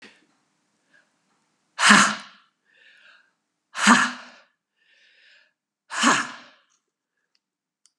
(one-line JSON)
{"exhalation_length": "8.0 s", "exhalation_amplitude": 32767, "exhalation_signal_mean_std_ratio": 0.27, "survey_phase": "beta (2021-08-13 to 2022-03-07)", "age": "65+", "gender": "Female", "wearing_mask": "No", "symptom_none": true, "smoker_status": "Never smoked", "respiratory_condition_asthma": true, "respiratory_condition_other": false, "recruitment_source": "REACT", "submission_delay": "2 days", "covid_test_result": "Negative", "covid_test_method": "RT-qPCR", "influenza_a_test_result": "Negative", "influenza_b_test_result": "Negative"}